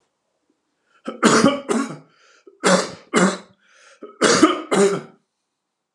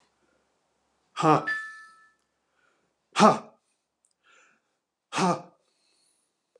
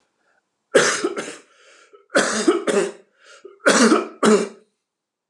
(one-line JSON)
{"three_cough_length": "5.9 s", "three_cough_amplitude": 31342, "three_cough_signal_mean_std_ratio": 0.44, "exhalation_length": "6.6 s", "exhalation_amplitude": 18976, "exhalation_signal_mean_std_ratio": 0.26, "cough_length": "5.3 s", "cough_amplitude": 27565, "cough_signal_mean_std_ratio": 0.47, "survey_phase": "alpha (2021-03-01 to 2021-08-12)", "age": "45-64", "gender": "Male", "wearing_mask": "No", "symptom_none": true, "smoker_status": "Never smoked", "respiratory_condition_asthma": false, "respiratory_condition_other": false, "recruitment_source": "REACT", "submission_delay": "1 day", "covid_test_result": "Negative", "covid_test_method": "RT-qPCR"}